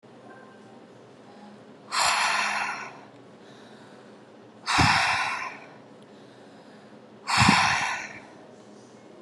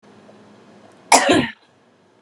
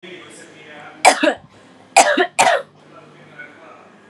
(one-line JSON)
{"exhalation_length": "9.2 s", "exhalation_amplitude": 20695, "exhalation_signal_mean_std_ratio": 0.48, "cough_length": "2.2 s", "cough_amplitude": 32768, "cough_signal_mean_std_ratio": 0.33, "three_cough_length": "4.1 s", "three_cough_amplitude": 32768, "three_cough_signal_mean_std_ratio": 0.37, "survey_phase": "beta (2021-08-13 to 2022-03-07)", "age": "18-44", "gender": "Female", "wearing_mask": "No", "symptom_runny_or_blocked_nose": true, "smoker_status": "Ex-smoker", "respiratory_condition_asthma": false, "respiratory_condition_other": false, "recruitment_source": "REACT", "submission_delay": "3 days", "covid_test_result": "Negative", "covid_test_method": "RT-qPCR"}